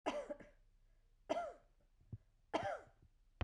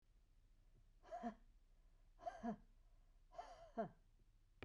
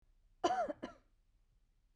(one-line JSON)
{"three_cough_length": "3.4 s", "three_cough_amplitude": 1998, "three_cough_signal_mean_std_ratio": 0.42, "exhalation_length": "4.6 s", "exhalation_amplitude": 636, "exhalation_signal_mean_std_ratio": 0.47, "cough_length": "2.0 s", "cough_amplitude": 3189, "cough_signal_mean_std_ratio": 0.35, "survey_phase": "beta (2021-08-13 to 2022-03-07)", "age": "45-64", "gender": "Female", "wearing_mask": "No", "symptom_shortness_of_breath": true, "symptom_fatigue": true, "symptom_onset": "12 days", "smoker_status": "Never smoked", "respiratory_condition_asthma": false, "respiratory_condition_other": false, "recruitment_source": "REACT", "submission_delay": "4 days", "covid_test_result": "Negative", "covid_test_method": "RT-qPCR", "influenza_a_test_result": "Negative", "influenza_b_test_result": "Negative"}